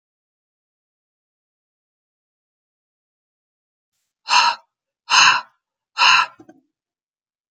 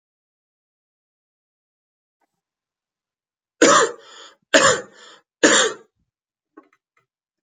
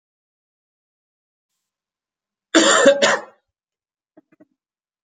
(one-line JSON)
{"exhalation_length": "7.5 s", "exhalation_amplitude": 30933, "exhalation_signal_mean_std_ratio": 0.26, "three_cough_length": "7.4 s", "three_cough_amplitude": 32767, "three_cough_signal_mean_std_ratio": 0.26, "cough_length": "5.0 s", "cough_amplitude": 30351, "cough_signal_mean_std_ratio": 0.28, "survey_phase": "alpha (2021-03-01 to 2021-08-12)", "age": "18-44", "gender": "Male", "wearing_mask": "No", "symptom_shortness_of_breath": true, "symptom_fatigue": true, "symptom_fever_high_temperature": true, "symptom_headache": true, "symptom_change_to_sense_of_smell_or_taste": true, "symptom_onset": "4 days", "smoker_status": "Ex-smoker", "respiratory_condition_asthma": false, "respiratory_condition_other": false, "recruitment_source": "Test and Trace", "submission_delay": "1 day", "covid_test_result": "Positive", "covid_test_method": "RT-qPCR"}